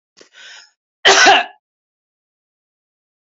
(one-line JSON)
{"cough_length": "3.2 s", "cough_amplitude": 31338, "cough_signal_mean_std_ratio": 0.29, "survey_phase": "beta (2021-08-13 to 2022-03-07)", "age": "45-64", "gender": "Female", "wearing_mask": "No", "symptom_none": true, "smoker_status": "Ex-smoker", "respiratory_condition_asthma": false, "respiratory_condition_other": false, "recruitment_source": "REACT", "submission_delay": "1 day", "covid_test_result": "Negative", "covid_test_method": "RT-qPCR", "influenza_a_test_result": "Unknown/Void", "influenza_b_test_result": "Unknown/Void"}